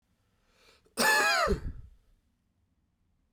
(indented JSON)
{
  "cough_length": "3.3 s",
  "cough_amplitude": 8192,
  "cough_signal_mean_std_ratio": 0.39,
  "survey_phase": "beta (2021-08-13 to 2022-03-07)",
  "age": "18-44",
  "gender": "Male",
  "wearing_mask": "No",
  "symptom_runny_or_blocked_nose": true,
  "symptom_change_to_sense_of_smell_or_taste": true,
  "symptom_onset": "2 days",
  "smoker_status": "Ex-smoker",
  "respiratory_condition_asthma": false,
  "respiratory_condition_other": false,
  "recruitment_source": "Test and Trace",
  "submission_delay": "1 day",
  "covid_test_result": "Positive",
  "covid_test_method": "RT-qPCR",
  "covid_ct_value": 23.4,
  "covid_ct_gene": "ORF1ab gene"
}